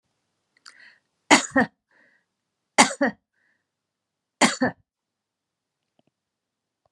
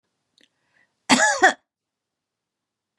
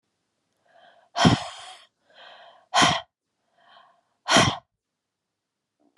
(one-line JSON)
{"three_cough_length": "6.9 s", "three_cough_amplitude": 32601, "three_cough_signal_mean_std_ratio": 0.23, "cough_length": "3.0 s", "cough_amplitude": 29684, "cough_signal_mean_std_ratio": 0.27, "exhalation_length": "6.0 s", "exhalation_amplitude": 22433, "exhalation_signal_mean_std_ratio": 0.29, "survey_phase": "beta (2021-08-13 to 2022-03-07)", "age": "65+", "gender": "Female", "wearing_mask": "No", "symptom_none": true, "smoker_status": "Never smoked", "respiratory_condition_asthma": false, "respiratory_condition_other": false, "recruitment_source": "REACT", "submission_delay": "1 day", "covid_test_result": "Negative", "covid_test_method": "RT-qPCR"}